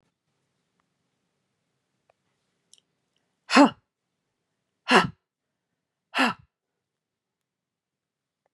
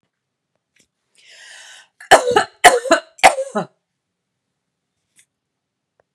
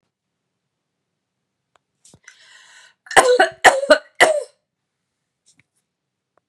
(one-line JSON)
{"exhalation_length": "8.5 s", "exhalation_amplitude": 23894, "exhalation_signal_mean_std_ratio": 0.18, "three_cough_length": "6.1 s", "three_cough_amplitude": 32768, "three_cough_signal_mean_std_ratio": 0.26, "cough_length": "6.5 s", "cough_amplitude": 32768, "cough_signal_mean_std_ratio": 0.26, "survey_phase": "beta (2021-08-13 to 2022-03-07)", "age": "45-64", "gender": "Female", "wearing_mask": "No", "symptom_none": true, "smoker_status": "Never smoked", "respiratory_condition_asthma": false, "respiratory_condition_other": false, "recruitment_source": "REACT", "submission_delay": "3 days", "covid_test_result": "Negative", "covid_test_method": "RT-qPCR", "influenza_a_test_result": "Negative", "influenza_b_test_result": "Negative"}